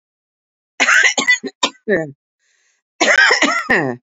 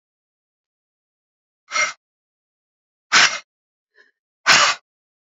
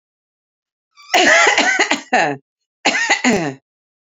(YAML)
cough_length: 4.2 s
cough_amplitude: 32768
cough_signal_mean_std_ratio: 0.52
exhalation_length: 5.4 s
exhalation_amplitude: 32767
exhalation_signal_mean_std_ratio: 0.27
three_cough_length: 4.0 s
three_cough_amplitude: 32767
three_cough_signal_mean_std_ratio: 0.54
survey_phase: beta (2021-08-13 to 2022-03-07)
age: 45-64
gender: Female
wearing_mask: 'No'
symptom_none: true
smoker_status: Ex-smoker
respiratory_condition_asthma: true
respiratory_condition_other: false
recruitment_source: REACT
submission_delay: 1 day
covid_test_result: Negative
covid_test_method: RT-qPCR
influenza_a_test_result: Negative
influenza_b_test_result: Negative